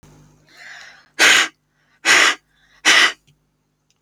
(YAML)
exhalation_length: 4.0 s
exhalation_amplitude: 31310
exhalation_signal_mean_std_ratio: 0.38
survey_phase: alpha (2021-03-01 to 2021-08-12)
age: 45-64
gender: Female
wearing_mask: 'No'
symptom_diarrhoea: true
symptom_headache: true
smoker_status: Never smoked
respiratory_condition_asthma: false
respiratory_condition_other: false
recruitment_source: REACT
submission_delay: 2 days
covid_test_result: Negative
covid_test_method: RT-qPCR